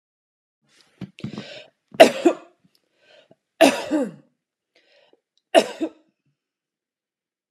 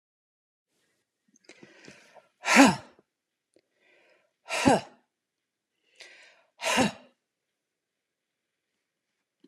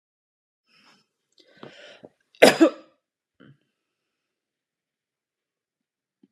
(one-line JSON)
{"three_cough_length": "7.5 s", "three_cough_amplitude": 32768, "three_cough_signal_mean_std_ratio": 0.23, "exhalation_length": "9.5 s", "exhalation_amplitude": 22691, "exhalation_signal_mean_std_ratio": 0.22, "cough_length": "6.3 s", "cough_amplitude": 32767, "cough_signal_mean_std_ratio": 0.15, "survey_phase": "beta (2021-08-13 to 2022-03-07)", "age": "45-64", "gender": "Female", "wearing_mask": "No", "symptom_none": true, "smoker_status": "Never smoked", "respiratory_condition_asthma": false, "respiratory_condition_other": false, "recruitment_source": "REACT", "submission_delay": "2 days", "covid_test_result": "Negative", "covid_test_method": "RT-qPCR"}